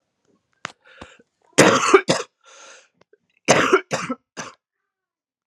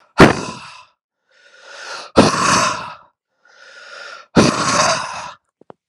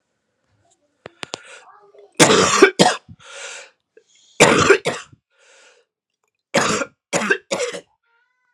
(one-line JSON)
{"cough_length": "5.5 s", "cough_amplitude": 32768, "cough_signal_mean_std_ratio": 0.32, "exhalation_length": "5.9 s", "exhalation_amplitude": 32768, "exhalation_signal_mean_std_ratio": 0.42, "three_cough_length": "8.5 s", "three_cough_amplitude": 32768, "three_cough_signal_mean_std_ratio": 0.36, "survey_phase": "alpha (2021-03-01 to 2021-08-12)", "age": "18-44", "gender": "Male", "wearing_mask": "No", "symptom_cough_any": true, "symptom_new_continuous_cough": true, "symptom_change_to_sense_of_smell_or_taste": true, "symptom_onset": "3 days", "smoker_status": "Never smoked", "respiratory_condition_asthma": true, "respiratory_condition_other": false, "recruitment_source": "Test and Trace", "submission_delay": "2 days", "covid_test_result": "Positive", "covid_test_method": "RT-qPCR", "covid_ct_value": 16.2, "covid_ct_gene": "ORF1ab gene", "covid_ct_mean": 16.2, "covid_viral_load": "4700000 copies/ml", "covid_viral_load_category": "High viral load (>1M copies/ml)"}